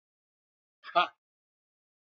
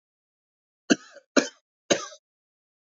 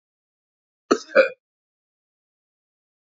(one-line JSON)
{"exhalation_length": "2.1 s", "exhalation_amplitude": 9563, "exhalation_signal_mean_std_ratio": 0.17, "three_cough_length": "2.9 s", "three_cough_amplitude": 22140, "three_cough_signal_mean_std_ratio": 0.2, "cough_length": "3.2 s", "cough_amplitude": 24804, "cough_signal_mean_std_ratio": 0.18, "survey_phase": "beta (2021-08-13 to 2022-03-07)", "age": "45-64", "gender": "Male", "wearing_mask": "No", "symptom_none": true, "smoker_status": "Current smoker (1 to 10 cigarettes per day)", "respiratory_condition_asthma": true, "respiratory_condition_other": false, "recruitment_source": "REACT", "submission_delay": "2 days", "covid_test_result": "Negative", "covid_test_method": "RT-qPCR", "influenza_a_test_result": "Negative", "influenza_b_test_result": "Negative"}